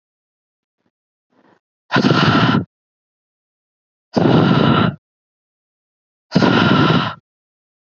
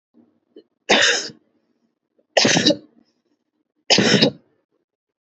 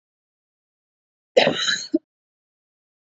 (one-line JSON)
{"exhalation_length": "7.9 s", "exhalation_amplitude": 32768, "exhalation_signal_mean_std_ratio": 0.45, "three_cough_length": "5.2 s", "three_cough_amplitude": 30598, "three_cough_signal_mean_std_ratio": 0.38, "cough_length": "3.2 s", "cough_amplitude": 27439, "cough_signal_mean_std_ratio": 0.27, "survey_phase": "beta (2021-08-13 to 2022-03-07)", "age": "18-44", "gender": "Female", "wearing_mask": "No", "symptom_none": true, "smoker_status": "Current smoker (e-cigarettes or vapes only)", "respiratory_condition_asthma": false, "respiratory_condition_other": false, "recruitment_source": "REACT", "submission_delay": "3 days", "covid_test_result": "Negative", "covid_test_method": "RT-qPCR", "influenza_a_test_result": "Negative", "influenza_b_test_result": "Negative"}